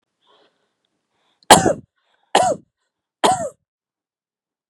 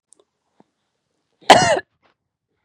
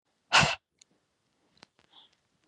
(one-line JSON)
{"three_cough_length": "4.7 s", "three_cough_amplitude": 32768, "three_cough_signal_mean_std_ratio": 0.26, "cough_length": "2.6 s", "cough_amplitude": 32768, "cough_signal_mean_std_ratio": 0.24, "exhalation_length": "2.5 s", "exhalation_amplitude": 12320, "exhalation_signal_mean_std_ratio": 0.22, "survey_phase": "beta (2021-08-13 to 2022-03-07)", "age": "18-44", "gender": "Female", "wearing_mask": "No", "symptom_none": true, "smoker_status": "Never smoked", "respiratory_condition_asthma": false, "respiratory_condition_other": false, "recruitment_source": "REACT", "submission_delay": "1 day", "covid_test_result": "Negative", "covid_test_method": "RT-qPCR"}